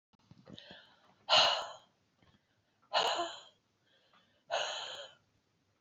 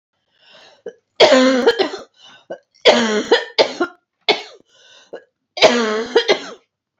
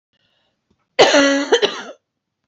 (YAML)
exhalation_length: 5.8 s
exhalation_amplitude: 6820
exhalation_signal_mean_std_ratio: 0.34
three_cough_length: 7.0 s
three_cough_amplitude: 32767
three_cough_signal_mean_std_ratio: 0.45
cough_length: 2.5 s
cough_amplitude: 29057
cough_signal_mean_std_ratio: 0.42
survey_phase: beta (2021-08-13 to 2022-03-07)
age: 45-64
gender: Female
wearing_mask: 'No'
symptom_cough_any: true
symptom_runny_or_blocked_nose: true
symptom_sore_throat: true
symptom_headache: true
symptom_onset: 5 days
smoker_status: Current smoker (1 to 10 cigarettes per day)
respiratory_condition_asthma: false
respiratory_condition_other: false
recruitment_source: REACT
submission_delay: 0 days
covid_test_result: Negative
covid_test_method: RT-qPCR
influenza_a_test_result: Unknown/Void
influenza_b_test_result: Unknown/Void